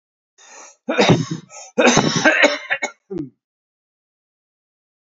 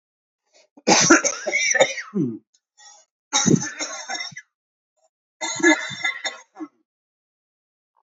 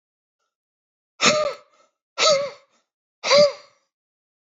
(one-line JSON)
{"cough_length": "5.0 s", "cough_amplitude": 32568, "cough_signal_mean_std_ratio": 0.41, "three_cough_length": "8.0 s", "three_cough_amplitude": 32767, "three_cough_signal_mean_std_ratio": 0.4, "exhalation_length": "4.4 s", "exhalation_amplitude": 25759, "exhalation_signal_mean_std_ratio": 0.36, "survey_phase": "alpha (2021-03-01 to 2021-08-12)", "age": "45-64", "gender": "Male", "wearing_mask": "No", "symptom_cough_any": true, "symptom_fatigue": true, "symptom_fever_high_temperature": true, "symptom_change_to_sense_of_smell_or_taste": true, "symptom_loss_of_taste": true, "symptom_onset": "4 days", "smoker_status": "Ex-smoker", "respiratory_condition_asthma": false, "respiratory_condition_other": false, "recruitment_source": "Test and Trace", "submission_delay": "1 day", "covid_test_result": "Positive", "covid_test_method": "RT-qPCR", "covid_ct_value": 13.7, "covid_ct_gene": "ORF1ab gene", "covid_ct_mean": 14.0, "covid_viral_load": "26000000 copies/ml", "covid_viral_load_category": "High viral load (>1M copies/ml)"}